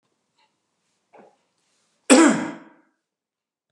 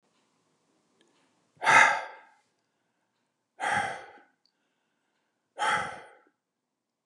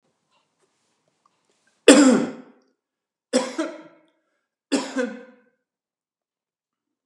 cough_length: 3.7 s
cough_amplitude: 32721
cough_signal_mean_std_ratio: 0.24
exhalation_length: 7.1 s
exhalation_amplitude: 18776
exhalation_signal_mean_std_ratio: 0.27
three_cough_length: 7.1 s
three_cough_amplitude: 32767
three_cough_signal_mean_std_ratio: 0.25
survey_phase: beta (2021-08-13 to 2022-03-07)
age: 45-64
gender: Male
wearing_mask: 'No'
symptom_none: true
smoker_status: Never smoked
respiratory_condition_asthma: false
respiratory_condition_other: false
recruitment_source: REACT
submission_delay: 31 days
covid_test_result: Negative
covid_test_method: RT-qPCR
influenza_a_test_result: Negative
influenza_b_test_result: Negative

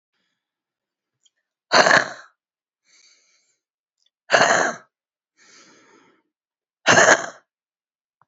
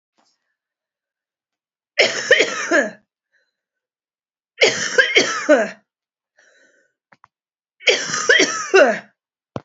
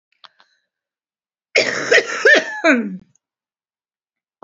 exhalation_length: 8.3 s
exhalation_amplitude: 32768
exhalation_signal_mean_std_ratio: 0.27
three_cough_length: 9.6 s
three_cough_amplitude: 31113
three_cough_signal_mean_std_ratio: 0.39
cough_length: 4.4 s
cough_amplitude: 30924
cough_signal_mean_std_ratio: 0.37
survey_phase: beta (2021-08-13 to 2022-03-07)
age: 45-64
gender: Female
wearing_mask: 'Yes'
symptom_cough_any: true
symptom_fever_high_temperature: true
symptom_headache: true
symptom_onset: 2 days
smoker_status: Never smoked
respiratory_condition_asthma: true
respiratory_condition_other: false
recruitment_source: Test and Trace
submission_delay: 2 days
covid_test_result: Positive
covid_test_method: RT-qPCR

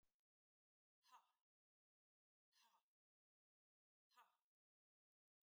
exhalation_length: 5.5 s
exhalation_amplitude: 48
exhalation_signal_mean_std_ratio: 0.24
survey_phase: beta (2021-08-13 to 2022-03-07)
age: 45-64
gender: Female
wearing_mask: 'No'
symptom_none: true
smoker_status: Never smoked
respiratory_condition_asthma: false
respiratory_condition_other: false
recruitment_source: REACT
submission_delay: 4 days
covid_test_result: Negative
covid_test_method: RT-qPCR
influenza_a_test_result: Negative
influenza_b_test_result: Negative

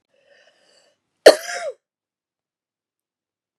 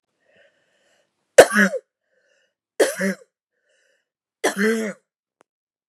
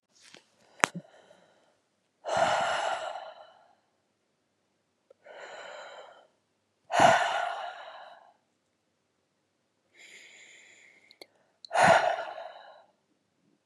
cough_length: 3.6 s
cough_amplitude: 32768
cough_signal_mean_std_ratio: 0.15
three_cough_length: 5.9 s
three_cough_amplitude: 32768
three_cough_signal_mean_std_ratio: 0.26
exhalation_length: 13.7 s
exhalation_amplitude: 32767
exhalation_signal_mean_std_ratio: 0.32
survey_phase: beta (2021-08-13 to 2022-03-07)
age: 45-64
gender: Female
wearing_mask: 'No'
symptom_cough_any: true
symptom_runny_or_blocked_nose: true
smoker_status: Never smoked
respiratory_condition_asthma: true
respiratory_condition_other: false
recruitment_source: REACT
submission_delay: 3 days
covid_test_result: Negative
covid_test_method: RT-qPCR
influenza_a_test_result: Negative
influenza_b_test_result: Negative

